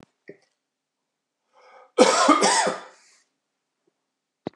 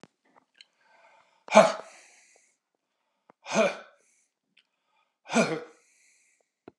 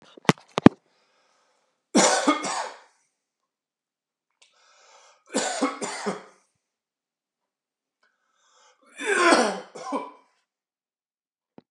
{
  "cough_length": "4.6 s",
  "cough_amplitude": 30023,
  "cough_signal_mean_std_ratio": 0.33,
  "exhalation_length": "6.8 s",
  "exhalation_amplitude": 24812,
  "exhalation_signal_mean_std_ratio": 0.23,
  "three_cough_length": "11.7 s",
  "three_cough_amplitude": 32768,
  "three_cough_signal_mean_std_ratio": 0.27,
  "survey_phase": "beta (2021-08-13 to 2022-03-07)",
  "age": "45-64",
  "gender": "Male",
  "wearing_mask": "No",
  "symptom_none": true,
  "smoker_status": "Never smoked",
  "respiratory_condition_asthma": false,
  "respiratory_condition_other": false,
  "recruitment_source": "REACT",
  "submission_delay": "2 days",
  "covid_test_result": "Negative",
  "covid_test_method": "RT-qPCR",
  "influenza_a_test_result": "Negative",
  "influenza_b_test_result": "Negative"
}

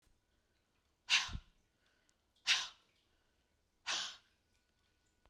{
  "exhalation_length": "5.3 s",
  "exhalation_amplitude": 4523,
  "exhalation_signal_mean_std_ratio": 0.26,
  "survey_phase": "beta (2021-08-13 to 2022-03-07)",
  "age": "45-64",
  "gender": "Female",
  "wearing_mask": "No",
  "symptom_cough_any": true,
  "symptom_new_continuous_cough": true,
  "symptom_runny_or_blocked_nose": true,
  "symptom_shortness_of_breath": true,
  "symptom_sore_throat": true,
  "symptom_fatigue": true,
  "symptom_fever_high_temperature": true,
  "symptom_headache": true,
  "symptom_change_to_sense_of_smell_or_taste": true,
  "symptom_onset": "4 days",
  "smoker_status": "Never smoked",
  "respiratory_condition_asthma": true,
  "respiratory_condition_other": false,
  "recruitment_source": "Test and Trace",
  "submission_delay": "1 day",
  "covid_test_result": "Positive",
  "covid_test_method": "RT-qPCR",
  "covid_ct_value": 14.0,
  "covid_ct_gene": "ORF1ab gene",
  "covid_ct_mean": 14.3,
  "covid_viral_load": "20000000 copies/ml",
  "covid_viral_load_category": "High viral load (>1M copies/ml)"
}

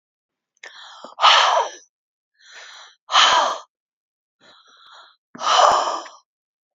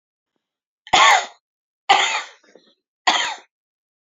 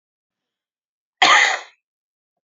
{
  "exhalation_length": "6.7 s",
  "exhalation_amplitude": 30953,
  "exhalation_signal_mean_std_ratio": 0.39,
  "three_cough_length": "4.1 s",
  "three_cough_amplitude": 28781,
  "three_cough_signal_mean_std_ratio": 0.35,
  "cough_length": "2.6 s",
  "cough_amplitude": 28300,
  "cough_signal_mean_std_ratio": 0.29,
  "survey_phase": "beta (2021-08-13 to 2022-03-07)",
  "age": "18-44",
  "gender": "Female",
  "wearing_mask": "No",
  "symptom_none": true,
  "smoker_status": "Current smoker (11 or more cigarettes per day)",
  "respiratory_condition_asthma": false,
  "respiratory_condition_other": false,
  "recruitment_source": "REACT",
  "submission_delay": "1 day",
  "covid_test_result": "Negative",
  "covid_test_method": "RT-qPCR"
}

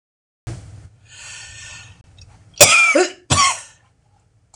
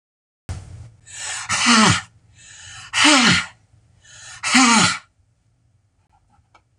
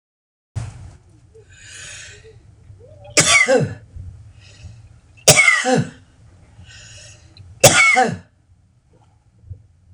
{
  "cough_length": "4.6 s",
  "cough_amplitude": 26028,
  "cough_signal_mean_std_ratio": 0.36,
  "exhalation_length": "6.8 s",
  "exhalation_amplitude": 26027,
  "exhalation_signal_mean_std_ratio": 0.43,
  "three_cough_length": "9.9 s",
  "three_cough_amplitude": 26028,
  "three_cough_signal_mean_std_ratio": 0.37,
  "survey_phase": "beta (2021-08-13 to 2022-03-07)",
  "age": "65+",
  "gender": "Female",
  "wearing_mask": "No",
  "symptom_cough_any": true,
  "symptom_runny_or_blocked_nose": true,
  "symptom_change_to_sense_of_smell_or_taste": true,
  "symptom_loss_of_taste": true,
  "symptom_other": true,
  "symptom_onset": "2 days",
  "smoker_status": "Ex-smoker",
  "respiratory_condition_asthma": false,
  "respiratory_condition_other": false,
  "recruitment_source": "Test and Trace",
  "submission_delay": "1 day",
  "covid_test_result": "Positive",
  "covid_test_method": "RT-qPCR",
  "covid_ct_value": 15.5,
  "covid_ct_gene": "N gene",
  "covid_ct_mean": 15.5,
  "covid_viral_load": "8100000 copies/ml",
  "covid_viral_load_category": "High viral load (>1M copies/ml)"
}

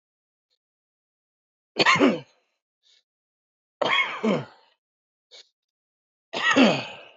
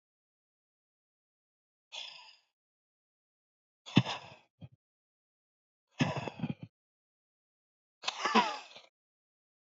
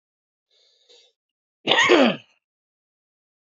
{
  "three_cough_length": "7.2 s",
  "three_cough_amplitude": 21417,
  "three_cough_signal_mean_std_ratio": 0.34,
  "exhalation_length": "9.6 s",
  "exhalation_amplitude": 12295,
  "exhalation_signal_mean_std_ratio": 0.23,
  "cough_length": "3.4 s",
  "cough_amplitude": 27972,
  "cough_signal_mean_std_ratio": 0.3,
  "survey_phase": "beta (2021-08-13 to 2022-03-07)",
  "age": "45-64",
  "gender": "Male",
  "wearing_mask": "No",
  "symptom_runny_or_blocked_nose": true,
  "symptom_headache": true,
  "smoker_status": "Ex-smoker",
  "respiratory_condition_asthma": true,
  "respiratory_condition_other": true,
  "recruitment_source": "REACT",
  "submission_delay": "2 days",
  "covid_test_result": "Negative",
  "covid_test_method": "RT-qPCR",
  "influenza_a_test_result": "Unknown/Void",
  "influenza_b_test_result": "Unknown/Void"
}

